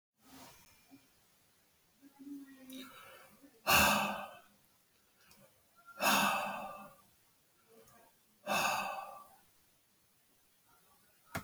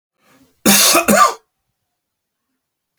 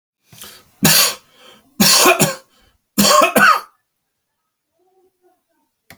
{
  "exhalation_length": "11.4 s",
  "exhalation_amplitude": 6175,
  "exhalation_signal_mean_std_ratio": 0.35,
  "cough_length": "3.0 s",
  "cough_amplitude": 32768,
  "cough_signal_mean_std_ratio": 0.38,
  "three_cough_length": "6.0 s",
  "three_cough_amplitude": 32768,
  "three_cough_signal_mean_std_ratio": 0.41,
  "survey_phase": "alpha (2021-03-01 to 2021-08-12)",
  "age": "65+",
  "gender": "Male",
  "wearing_mask": "No",
  "symptom_none": true,
  "smoker_status": "Ex-smoker",
  "respiratory_condition_asthma": false,
  "respiratory_condition_other": false,
  "recruitment_source": "REACT",
  "submission_delay": "7 days",
  "covid_test_result": "Negative",
  "covid_test_method": "RT-qPCR"
}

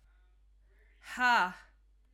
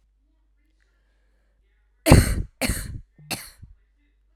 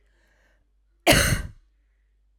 {
  "exhalation_length": "2.1 s",
  "exhalation_amplitude": 5718,
  "exhalation_signal_mean_std_ratio": 0.35,
  "three_cough_length": "4.4 s",
  "three_cough_amplitude": 32768,
  "three_cough_signal_mean_std_ratio": 0.26,
  "cough_length": "2.4 s",
  "cough_amplitude": 28388,
  "cough_signal_mean_std_ratio": 0.31,
  "survey_phase": "beta (2021-08-13 to 2022-03-07)",
  "age": "18-44",
  "gender": "Female",
  "wearing_mask": "No",
  "symptom_cough_any": true,
  "symptom_runny_or_blocked_nose": true,
  "symptom_sore_throat": true,
  "symptom_abdominal_pain": true,
  "symptom_fatigue": true,
  "symptom_fever_high_temperature": true,
  "symptom_headache": true,
  "symptom_change_to_sense_of_smell_or_taste": true,
  "symptom_other": true,
  "symptom_onset": "4 days",
  "smoker_status": "Ex-smoker",
  "respiratory_condition_asthma": false,
  "respiratory_condition_other": false,
  "recruitment_source": "Test and Trace",
  "submission_delay": "2 days",
  "covid_test_result": "Positive",
  "covid_test_method": "RT-qPCR"
}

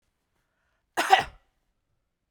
{
  "cough_length": "2.3 s",
  "cough_amplitude": 23999,
  "cough_signal_mean_std_ratio": 0.22,
  "survey_phase": "beta (2021-08-13 to 2022-03-07)",
  "age": "45-64",
  "gender": "Female",
  "wearing_mask": "No",
  "symptom_none": true,
  "smoker_status": "Ex-smoker",
  "respiratory_condition_asthma": false,
  "respiratory_condition_other": false,
  "recruitment_source": "REACT",
  "submission_delay": "1 day",
  "covid_test_result": "Negative",
  "covid_test_method": "RT-qPCR"
}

